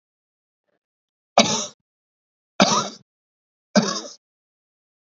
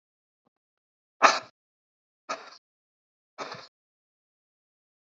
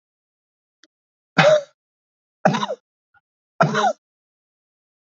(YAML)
cough_length: 5.0 s
cough_amplitude: 30528
cough_signal_mean_std_ratio: 0.27
exhalation_length: 5.0 s
exhalation_amplitude: 25154
exhalation_signal_mean_std_ratio: 0.16
three_cough_length: 5.0 s
three_cough_amplitude: 27764
three_cough_signal_mean_std_ratio: 0.3
survey_phase: beta (2021-08-13 to 2022-03-07)
age: 45-64
gender: Male
wearing_mask: 'No'
symptom_cough_any: true
symptom_sore_throat: true
symptom_fatigue: true
symptom_headache: true
symptom_change_to_sense_of_smell_or_taste: true
symptom_onset: 3 days
smoker_status: Never smoked
respiratory_condition_asthma: false
respiratory_condition_other: false
recruitment_source: Test and Trace
submission_delay: 2 days
covid_test_result: Positive
covid_test_method: RT-qPCR
covid_ct_value: 10.6
covid_ct_gene: ORF1ab gene
covid_ct_mean: 10.9
covid_viral_load: 260000000 copies/ml
covid_viral_load_category: High viral load (>1M copies/ml)